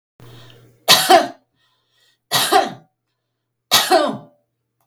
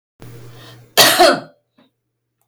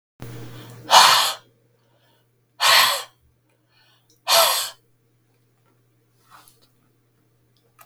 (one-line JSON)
{"three_cough_length": "4.9 s", "three_cough_amplitude": 32768, "three_cough_signal_mean_std_ratio": 0.38, "cough_length": "2.5 s", "cough_amplitude": 32768, "cough_signal_mean_std_ratio": 0.36, "exhalation_length": "7.9 s", "exhalation_amplitude": 32768, "exhalation_signal_mean_std_ratio": 0.32, "survey_phase": "beta (2021-08-13 to 2022-03-07)", "age": "65+", "gender": "Female", "wearing_mask": "No", "symptom_none": true, "smoker_status": "Never smoked", "respiratory_condition_asthma": false, "respiratory_condition_other": false, "recruitment_source": "REACT", "submission_delay": "1 day", "covid_test_result": "Negative", "covid_test_method": "RT-qPCR", "influenza_a_test_result": "Unknown/Void", "influenza_b_test_result": "Unknown/Void"}